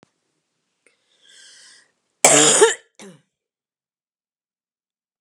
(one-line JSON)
{"cough_length": "5.2 s", "cough_amplitude": 32768, "cough_signal_mean_std_ratio": 0.25, "survey_phase": "beta (2021-08-13 to 2022-03-07)", "age": "65+", "gender": "Female", "wearing_mask": "No", "symptom_none": true, "smoker_status": "Ex-smoker", "respiratory_condition_asthma": false, "respiratory_condition_other": false, "recruitment_source": "REACT", "submission_delay": "7 days", "covid_test_result": "Negative", "covid_test_method": "RT-qPCR", "influenza_a_test_result": "Negative", "influenza_b_test_result": "Negative"}